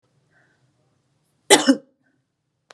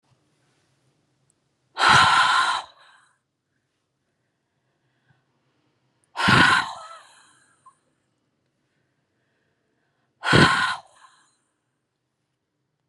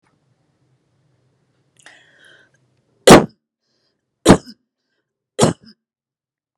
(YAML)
cough_length: 2.7 s
cough_amplitude: 32768
cough_signal_mean_std_ratio: 0.21
exhalation_length: 12.9 s
exhalation_amplitude: 26579
exhalation_signal_mean_std_ratio: 0.3
three_cough_length: 6.6 s
three_cough_amplitude: 32768
three_cough_signal_mean_std_ratio: 0.19
survey_phase: beta (2021-08-13 to 2022-03-07)
age: 45-64
gender: Female
wearing_mask: 'No'
symptom_none: true
smoker_status: Never smoked
respiratory_condition_asthma: false
respiratory_condition_other: false
recruitment_source: REACT
submission_delay: 1 day
covid_test_result: Negative
covid_test_method: RT-qPCR
influenza_a_test_result: Negative
influenza_b_test_result: Negative